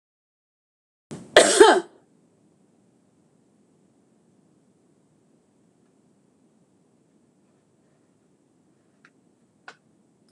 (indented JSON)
{
  "cough_length": "10.3 s",
  "cough_amplitude": 26028,
  "cough_signal_mean_std_ratio": 0.16,
  "survey_phase": "beta (2021-08-13 to 2022-03-07)",
  "age": "65+",
  "gender": "Female",
  "wearing_mask": "No",
  "symptom_none": true,
  "smoker_status": "Ex-smoker",
  "respiratory_condition_asthma": false,
  "respiratory_condition_other": false,
  "recruitment_source": "REACT",
  "submission_delay": "2 days",
  "covid_test_result": "Negative",
  "covid_test_method": "RT-qPCR"
}